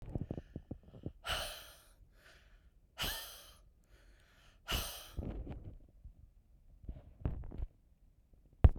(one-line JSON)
{"exhalation_length": "8.8 s", "exhalation_amplitude": 11235, "exhalation_signal_mean_std_ratio": 0.31, "survey_phase": "beta (2021-08-13 to 2022-03-07)", "age": "45-64", "gender": "Female", "wearing_mask": "No", "symptom_headache": true, "smoker_status": "Ex-smoker", "respiratory_condition_asthma": false, "respiratory_condition_other": false, "recruitment_source": "REACT", "submission_delay": "1 day", "covid_test_result": "Negative", "covid_test_method": "RT-qPCR", "influenza_a_test_result": "Unknown/Void", "influenza_b_test_result": "Unknown/Void"}